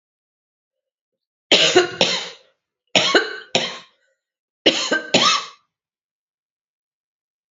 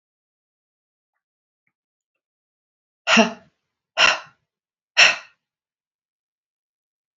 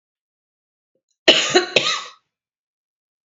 {"three_cough_length": "7.5 s", "three_cough_amplitude": 32666, "three_cough_signal_mean_std_ratio": 0.36, "exhalation_length": "7.2 s", "exhalation_amplitude": 29246, "exhalation_signal_mean_std_ratio": 0.22, "cough_length": "3.2 s", "cough_amplitude": 30021, "cough_signal_mean_std_ratio": 0.3, "survey_phase": "beta (2021-08-13 to 2022-03-07)", "age": "45-64", "gender": "Female", "wearing_mask": "No", "symptom_cough_any": true, "symptom_runny_or_blocked_nose": true, "symptom_shortness_of_breath": true, "symptom_fatigue": true, "symptom_headache": true, "smoker_status": "Ex-smoker", "respiratory_condition_asthma": false, "respiratory_condition_other": false, "recruitment_source": "Test and Trace", "submission_delay": "2 days", "covid_test_result": "Positive", "covid_test_method": "RT-qPCR", "covid_ct_value": 25.9, "covid_ct_gene": "ORF1ab gene"}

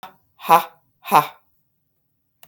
{"exhalation_length": "2.5 s", "exhalation_amplitude": 32654, "exhalation_signal_mean_std_ratio": 0.25, "survey_phase": "beta (2021-08-13 to 2022-03-07)", "age": "45-64", "gender": "Female", "wearing_mask": "No", "symptom_sore_throat": true, "symptom_abdominal_pain": true, "symptom_fatigue": true, "symptom_headache": true, "symptom_change_to_sense_of_smell_or_taste": true, "symptom_onset": "2 days", "smoker_status": "Ex-smoker", "respiratory_condition_asthma": false, "respiratory_condition_other": false, "recruitment_source": "Test and Trace", "submission_delay": "1 day", "covid_test_result": "Positive", "covid_test_method": "RT-qPCR", "covid_ct_value": 18.3, "covid_ct_gene": "ORF1ab gene", "covid_ct_mean": 18.9, "covid_viral_load": "650000 copies/ml", "covid_viral_load_category": "Low viral load (10K-1M copies/ml)"}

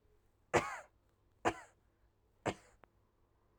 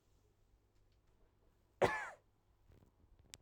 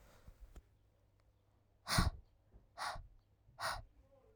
{"three_cough_length": "3.6 s", "three_cough_amplitude": 4780, "three_cough_signal_mean_std_ratio": 0.25, "cough_length": "3.4 s", "cough_amplitude": 4496, "cough_signal_mean_std_ratio": 0.22, "exhalation_length": "4.4 s", "exhalation_amplitude": 3703, "exhalation_signal_mean_std_ratio": 0.33, "survey_phase": "alpha (2021-03-01 to 2021-08-12)", "age": "18-44", "gender": "Female", "wearing_mask": "No", "symptom_shortness_of_breath": true, "symptom_fatigue": true, "symptom_headache": true, "symptom_onset": "3 days", "smoker_status": "Current smoker (1 to 10 cigarettes per day)", "respiratory_condition_asthma": false, "respiratory_condition_other": false, "recruitment_source": "Test and Trace", "submission_delay": "2 days", "covid_test_result": "Positive", "covid_test_method": "RT-qPCR", "covid_ct_value": 20.0, "covid_ct_gene": "ORF1ab gene", "covid_ct_mean": 21.1, "covid_viral_load": "120000 copies/ml", "covid_viral_load_category": "Low viral load (10K-1M copies/ml)"}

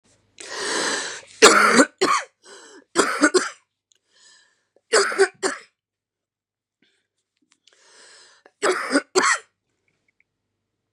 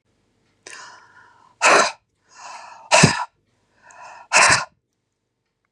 {"three_cough_length": "10.9 s", "three_cough_amplitude": 32768, "three_cough_signal_mean_std_ratio": 0.36, "exhalation_length": "5.7 s", "exhalation_amplitude": 32768, "exhalation_signal_mean_std_ratio": 0.33, "survey_phase": "beta (2021-08-13 to 2022-03-07)", "age": "45-64", "gender": "Female", "wearing_mask": "No", "symptom_new_continuous_cough": true, "symptom_runny_or_blocked_nose": true, "symptom_fever_high_temperature": true, "symptom_change_to_sense_of_smell_or_taste": true, "symptom_other": true, "symptom_onset": "3 days", "smoker_status": "Ex-smoker", "respiratory_condition_asthma": true, "respiratory_condition_other": false, "recruitment_source": "Test and Trace", "submission_delay": "2 days", "covid_test_result": "Positive", "covid_test_method": "RT-qPCR", "covid_ct_value": 12.7, "covid_ct_gene": "ORF1ab gene", "covid_ct_mean": 13.4, "covid_viral_load": "41000000 copies/ml", "covid_viral_load_category": "High viral load (>1M copies/ml)"}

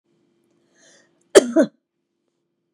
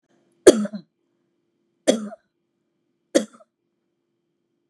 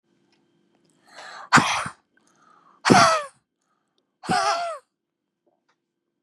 {"cough_length": "2.7 s", "cough_amplitude": 32768, "cough_signal_mean_std_ratio": 0.2, "three_cough_length": "4.7 s", "three_cough_amplitude": 32768, "three_cough_signal_mean_std_ratio": 0.19, "exhalation_length": "6.2 s", "exhalation_amplitude": 31406, "exhalation_signal_mean_std_ratio": 0.32, "survey_phase": "beta (2021-08-13 to 2022-03-07)", "age": "45-64", "gender": "Female", "wearing_mask": "No", "symptom_shortness_of_breath": true, "symptom_abdominal_pain": true, "symptom_fatigue": true, "symptom_change_to_sense_of_smell_or_taste": true, "smoker_status": "Never smoked", "respiratory_condition_asthma": true, "respiratory_condition_other": true, "recruitment_source": "REACT", "submission_delay": "1 day", "covid_test_result": "Negative", "covid_test_method": "RT-qPCR", "influenza_a_test_result": "Negative", "influenza_b_test_result": "Negative"}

